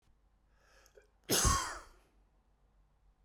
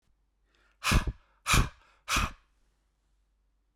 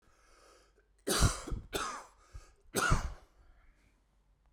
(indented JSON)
{
  "cough_length": "3.2 s",
  "cough_amplitude": 5538,
  "cough_signal_mean_std_ratio": 0.31,
  "exhalation_length": "3.8 s",
  "exhalation_amplitude": 8941,
  "exhalation_signal_mean_std_ratio": 0.33,
  "three_cough_length": "4.5 s",
  "three_cough_amplitude": 6522,
  "three_cough_signal_mean_std_ratio": 0.37,
  "survey_phase": "beta (2021-08-13 to 2022-03-07)",
  "age": "45-64",
  "gender": "Male",
  "wearing_mask": "No",
  "symptom_none": true,
  "smoker_status": "Ex-smoker",
  "respiratory_condition_asthma": false,
  "respiratory_condition_other": false,
  "recruitment_source": "REACT",
  "submission_delay": "0 days",
  "covid_test_result": "Negative",
  "covid_test_method": "RT-qPCR"
}